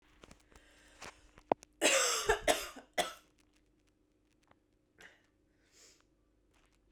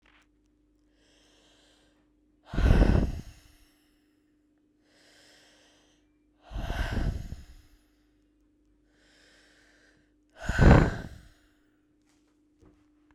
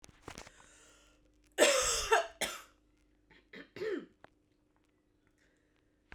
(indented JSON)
{
  "three_cough_length": "6.9 s",
  "three_cough_amplitude": 10295,
  "three_cough_signal_mean_std_ratio": 0.29,
  "exhalation_length": "13.1 s",
  "exhalation_amplitude": 23482,
  "exhalation_signal_mean_std_ratio": 0.27,
  "cough_length": "6.1 s",
  "cough_amplitude": 8622,
  "cough_signal_mean_std_ratio": 0.32,
  "survey_phase": "beta (2021-08-13 to 2022-03-07)",
  "age": "18-44",
  "gender": "Female",
  "wearing_mask": "No",
  "symptom_runny_or_blocked_nose": true,
  "symptom_diarrhoea": true,
  "symptom_headache": true,
  "symptom_change_to_sense_of_smell_or_taste": true,
  "symptom_loss_of_taste": true,
  "symptom_onset": "4 days",
  "smoker_status": "Never smoked",
  "respiratory_condition_asthma": false,
  "respiratory_condition_other": false,
  "recruitment_source": "Test and Trace",
  "submission_delay": "2 days",
  "covid_test_result": "Positive",
  "covid_test_method": "RT-qPCR",
  "covid_ct_value": 16.4,
  "covid_ct_gene": "ORF1ab gene",
  "covid_ct_mean": 16.8,
  "covid_viral_load": "3100000 copies/ml",
  "covid_viral_load_category": "High viral load (>1M copies/ml)"
}